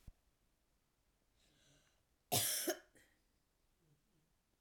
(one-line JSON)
{"cough_length": "4.6 s", "cough_amplitude": 2361, "cough_signal_mean_std_ratio": 0.26, "survey_phase": "alpha (2021-03-01 to 2021-08-12)", "age": "45-64", "gender": "Female", "wearing_mask": "No", "symptom_cough_any": true, "symptom_diarrhoea": true, "symptom_fatigue": true, "smoker_status": "Never smoked", "respiratory_condition_asthma": false, "respiratory_condition_other": false, "recruitment_source": "Test and Trace", "submission_delay": "1 day", "covid_test_result": "Positive", "covid_test_method": "RT-qPCR", "covid_ct_value": 18.7, "covid_ct_gene": "ORF1ab gene", "covid_ct_mean": 19.7, "covid_viral_load": "340000 copies/ml", "covid_viral_load_category": "Low viral load (10K-1M copies/ml)"}